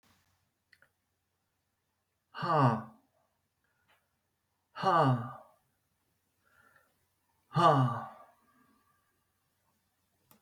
{"exhalation_length": "10.4 s", "exhalation_amplitude": 8684, "exhalation_signal_mean_std_ratio": 0.29, "survey_phase": "beta (2021-08-13 to 2022-03-07)", "age": "65+", "gender": "Male", "wearing_mask": "No", "symptom_none": true, "symptom_onset": "3 days", "smoker_status": "Never smoked", "respiratory_condition_asthma": false, "respiratory_condition_other": false, "recruitment_source": "REACT", "submission_delay": "2 days", "covid_test_result": "Negative", "covid_test_method": "RT-qPCR", "influenza_a_test_result": "Negative", "influenza_b_test_result": "Negative"}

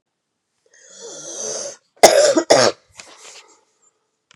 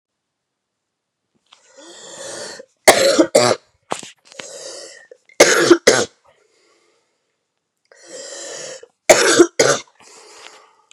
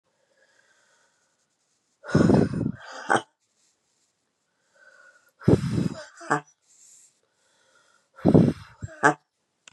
{"cough_length": "4.4 s", "cough_amplitude": 32768, "cough_signal_mean_std_ratio": 0.33, "three_cough_length": "10.9 s", "three_cough_amplitude": 32768, "three_cough_signal_mean_std_ratio": 0.33, "exhalation_length": "9.7 s", "exhalation_amplitude": 26869, "exhalation_signal_mean_std_ratio": 0.3, "survey_phase": "beta (2021-08-13 to 2022-03-07)", "age": "45-64", "gender": "Female", "wearing_mask": "No", "symptom_cough_any": true, "symptom_new_continuous_cough": true, "symptom_runny_or_blocked_nose": true, "symptom_shortness_of_breath": true, "symptom_fatigue": true, "symptom_headache": true, "symptom_change_to_sense_of_smell_or_taste": true, "symptom_onset": "3 days", "smoker_status": "Ex-smoker", "respiratory_condition_asthma": false, "respiratory_condition_other": false, "recruitment_source": "Test and Trace", "submission_delay": "2 days", "covid_test_result": "Positive", "covid_test_method": "RT-qPCR", "covid_ct_value": 15.8, "covid_ct_gene": "ORF1ab gene", "covid_ct_mean": 16.2, "covid_viral_load": "4700000 copies/ml", "covid_viral_load_category": "High viral load (>1M copies/ml)"}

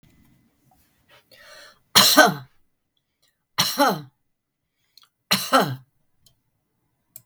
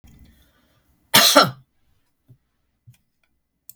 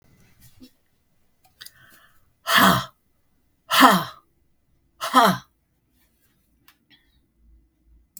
{"three_cough_length": "7.3 s", "three_cough_amplitude": 32768, "three_cough_signal_mean_std_ratio": 0.29, "cough_length": "3.8 s", "cough_amplitude": 32768, "cough_signal_mean_std_ratio": 0.24, "exhalation_length": "8.2 s", "exhalation_amplitude": 32768, "exhalation_signal_mean_std_ratio": 0.27, "survey_phase": "beta (2021-08-13 to 2022-03-07)", "age": "65+", "gender": "Female", "wearing_mask": "No", "symptom_none": true, "smoker_status": "Ex-smoker", "respiratory_condition_asthma": false, "respiratory_condition_other": false, "recruitment_source": "REACT", "submission_delay": "2 days", "covid_test_result": "Negative", "covid_test_method": "RT-qPCR", "influenza_a_test_result": "Negative", "influenza_b_test_result": "Negative"}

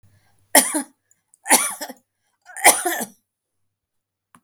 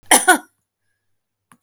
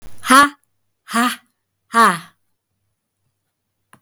{"three_cough_length": "4.4 s", "three_cough_amplitude": 32768, "three_cough_signal_mean_std_ratio": 0.3, "cough_length": "1.6 s", "cough_amplitude": 32768, "cough_signal_mean_std_ratio": 0.28, "exhalation_length": "4.0 s", "exhalation_amplitude": 32768, "exhalation_signal_mean_std_ratio": 0.33, "survey_phase": "beta (2021-08-13 to 2022-03-07)", "age": "45-64", "gender": "Female", "wearing_mask": "No", "symptom_none": true, "smoker_status": "Ex-smoker", "respiratory_condition_asthma": false, "respiratory_condition_other": false, "recruitment_source": "REACT", "submission_delay": "7 days", "covid_test_result": "Negative", "covid_test_method": "RT-qPCR", "influenza_a_test_result": "Negative", "influenza_b_test_result": "Negative"}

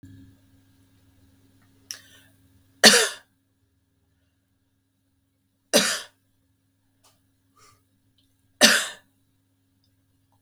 {"three_cough_length": "10.4 s", "three_cough_amplitude": 32767, "three_cough_signal_mean_std_ratio": 0.2, "survey_phase": "beta (2021-08-13 to 2022-03-07)", "age": "45-64", "gender": "Female", "wearing_mask": "No", "symptom_runny_or_blocked_nose": true, "symptom_sore_throat": true, "symptom_headache": true, "smoker_status": "Ex-smoker", "respiratory_condition_asthma": false, "respiratory_condition_other": false, "recruitment_source": "Test and Trace", "submission_delay": "1 day", "covid_test_result": "Negative", "covid_test_method": "ePCR"}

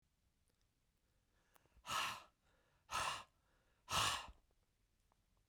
{"exhalation_length": "5.5 s", "exhalation_amplitude": 1829, "exhalation_signal_mean_std_ratio": 0.35, "survey_phase": "beta (2021-08-13 to 2022-03-07)", "age": "65+", "gender": "Male", "wearing_mask": "No", "symptom_none": true, "smoker_status": "Never smoked", "respiratory_condition_asthma": false, "respiratory_condition_other": false, "recruitment_source": "REACT", "submission_delay": "2 days", "covid_test_result": "Negative", "covid_test_method": "RT-qPCR", "influenza_a_test_result": "Negative", "influenza_b_test_result": "Negative"}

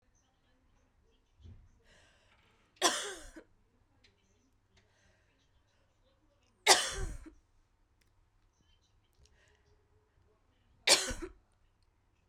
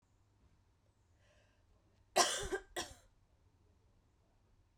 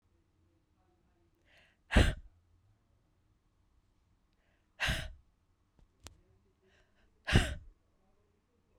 {"three_cough_length": "12.3 s", "three_cough_amplitude": 15395, "three_cough_signal_mean_std_ratio": 0.21, "cough_length": "4.8 s", "cough_amplitude": 4930, "cough_signal_mean_std_ratio": 0.25, "exhalation_length": "8.8 s", "exhalation_amplitude": 8378, "exhalation_signal_mean_std_ratio": 0.21, "survey_phase": "beta (2021-08-13 to 2022-03-07)", "age": "18-44", "gender": "Female", "wearing_mask": "No", "symptom_cough_any": true, "symptom_sore_throat": true, "symptom_headache": true, "smoker_status": "Never smoked", "respiratory_condition_asthma": false, "respiratory_condition_other": false, "recruitment_source": "Test and Trace", "submission_delay": "1 day", "covid_test_result": "Positive", "covid_test_method": "RT-qPCR", "covid_ct_value": 25.7, "covid_ct_gene": "ORF1ab gene"}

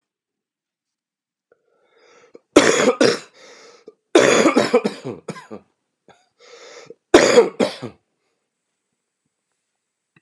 {"cough_length": "10.2 s", "cough_amplitude": 32768, "cough_signal_mean_std_ratio": 0.32, "survey_phase": "beta (2021-08-13 to 2022-03-07)", "age": "18-44", "gender": "Male", "wearing_mask": "No", "symptom_cough_any": true, "symptom_new_continuous_cough": true, "symptom_runny_or_blocked_nose": true, "symptom_onset": "3 days", "smoker_status": "Ex-smoker", "respiratory_condition_asthma": true, "respiratory_condition_other": false, "recruitment_source": "Test and Trace", "submission_delay": "2 days", "covid_test_result": "Positive", "covid_test_method": "RT-qPCR", "covid_ct_value": 19.9, "covid_ct_gene": "N gene", "covid_ct_mean": 20.1, "covid_viral_load": "250000 copies/ml", "covid_viral_load_category": "Low viral load (10K-1M copies/ml)"}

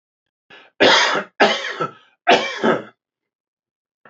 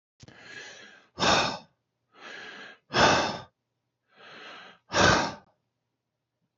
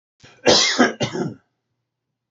{"three_cough_length": "4.1 s", "three_cough_amplitude": 30877, "three_cough_signal_mean_std_ratio": 0.43, "exhalation_length": "6.6 s", "exhalation_amplitude": 18333, "exhalation_signal_mean_std_ratio": 0.37, "cough_length": "2.3 s", "cough_amplitude": 27197, "cough_signal_mean_std_ratio": 0.42, "survey_phase": "beta (2021-08-13 to 2022-03-07)", "age": "45-64", "gender": "Male", "wearing_mask": "No", "symptom_none": true, "smoker_status": "Ex-smoker", "respiratory_condition_asthma": false, "respiratory_condition_other": false, "recruitment_source": "REACT", "submission_delay": "1 day", "covid_test_result": "Negative", "covid_test_method": "RT-qPCR", "influenza_a_test_result": "Unknown/Void", "influenza_b_test_result": "Unknown/Void"}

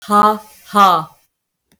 {"exhalation_length": "1.8 s", "exhalation_amplitude": 32768, "exhalation_signal_mean_std_ratio": 0.48, "survey_phase": "beta (2021-08-13 to 2022-03-07)", "age": "45-64", "gender": "Female", "wearing_mask": "No", "symptom_none": true, "smoker_status": "Never smoked", "respiratory_condition_asthma": false, "respiratory_condition_other": false, "recruitment_source": "REACT", "submission_delay": "1 day", "covid_test_result": "Negative", "covid_test_method": "RT-qPCR", "influenza_a_test_result": "Unknown/Void", "influenza_b_test_result": "Unknown/Void"}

